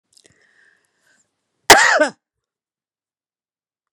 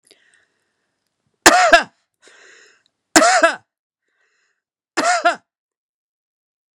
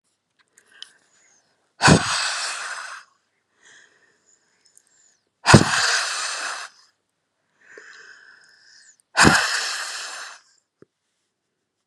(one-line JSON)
{"cough_length": "3.9 s", "cough_amplitude": 32768, "cough_signal_mean_std_ratio": 0.23, "three_cough_length": "6.7 s", "three_cough_amplitude": 32768, "three_cough_signal_mean_std_ratio": 0.3, "exhalation_length": "11.9 s", "exhalation_amplitude": 32768, "exhalation_signal_mean_std_ratio": 0.32, "survey_phase": "beta (2021-08-13 to 2022-03-07)", "age": "65+", "gender": "Female", "wearing_mask": "No", "symptom_none": true, "smoker_status": "Ex-smoker", "respiratory_condition_asthma": false, "respiratory_condition_other": false, "recruitment_source": "REACT", "submission_delay": "1 day", "covid_test_result": "Negative", "covid_test_method": "RT-qPCR"}